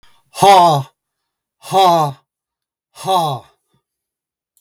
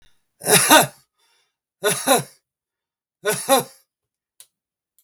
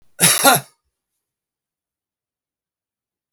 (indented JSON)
{
  "exhalation_length": "4.6 s",
  "exhalation_amplitude": 32768,
  "exhalation_signal_mean_std_ratio": 0.41,
  "three_cough_length": "5.0 s",
  "three_cough_amplitude": 32768,
  "three_cough_signal_mean_std_ratio": 0.34,
  "cough_length": "3.3 s",
  "cough_amplitude": 32768,
  "cough_signal_mean_std_ratio": 0.26,
  "survey_phase": "beta (2021-08-13 to 2022-03-07)",
  "age": "65+",
  "gender": "Male",
  "wearing_mask": "No",
  "symptom_none": true,
  "smoker_status": "Ex-smoker",
  "respiratory_condition_asthma": false,
  "respiratory_condition_other": false,
  "recruitment_source": "REACT",
  "submission_delay": "1 day",
  "covid_test_result": "Negative",
  "covid_test_method": "RT-qPCR",
  "influenza_a_test_result": "Negative",
  "influenza_b_test_result": "Negative"
}